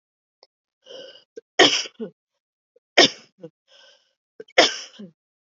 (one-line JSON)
{"three_cough_length": "5.5 s", "three_cough_amplitude": 29725, "three_cough_signal_mean_std_ratio": 0.24, "survey_phase": "beta (2021-08-13 to 2022-03-07)", "age": "18-44", "gender": "Female", "wearing_mask": "No", "symptom_cough_any": true, "symptom_runny_or_blocked_nose": true, "symptom_onset": "4 days", "smoker_status": "Ex-smoker", "respiratory_condition_asthma": false, "respiratory_condition_other": false, "recruitment_source": "REACT", "submission_delay": "4 days", "covid_test_result": "Negative", "covid_test_method": "RT-qPCR", "influenza_a_test_result": "Negative", "influenza_b_test_result": "Negative"}